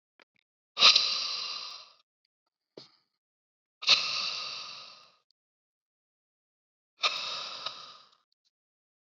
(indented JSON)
{
  "exhalation_length": "9.0 s",
  "exhalation_amplitude": 20874,
  "exhalation_signal_mean_std_ratio": 0.31,
  "survey_phase": "beta (2021-08-13 to 2022-03-07)",
  "age": "45-64",
  "gender": "Male",
  "wearing_mask": "No",
  "symptom_none": true,
  "smoker_status": "Never smoked",
  "respiratory_condition_asthma": false,
  "respiratory_condition_other": false,
  "recruitment_source": "REACT",
  "submission_delay": "3 days",
  "covid_test_result": "Negative",
  "covid_test_method": "RT-qPCR",
  "influenza_a_test_result": "Negative",
  "influenza_b_test_result": "Negative"
}